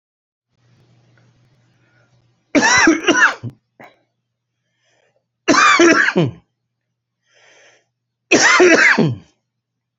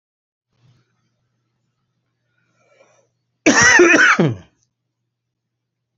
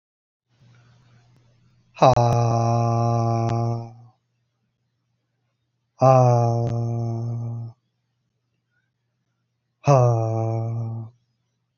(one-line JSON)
{"three_cough_length": "10.0 s", "three_cough_amplitude": 32767, "three_cough_signal_mean_std_ratio": 0.41, "cough_length": "6.0 s", "cough_amplitude": 32322, "cough_signal_mean_std_ratio": 0.31, "exhalation_length": "11.8 s", "exhalation_amplitude": 30782, "exhalation_signal_mean_std_ratio": 0.52, "survey_phase": "beta (2021-08-13 to 2022-03-07)", "age": "45-64", "gender": "Male", "wearing_mask": "No", "symptom_none": true, "smoker_status": "Ex-smoker", "respiratory_condition_asthma": true, "respiratory_condition_other": false, "recruitment_source": "REACT", "submission_delay": "3 days", "covid_test_result": "Negative", "covid_test_method": "RT-qPCR"}